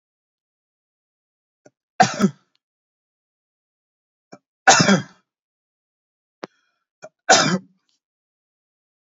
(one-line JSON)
{"three_cough_length": "9.0 s", "three_cough_amplitude": 32619, "three_cough_signal_mean_std_ratio": 0.23, "survey_phase": "beta (2021-08-13 to 2022-03-07)", "age": "45-64", "gender": "Male", "wearing_mask": "No", "symptom_none": true, "smoker_status": "Never smoked", "respiratory_condition_asthma": false, "respiratory_condition_other": false, "recruitment_source": "REACT", "submission_delay": "3 days", "covid_test_result": "Negative", "covid_test_method": "RT-qPCR", "influenza_a_test_result": "Negative", "influenza_b_test_result": "Negative"}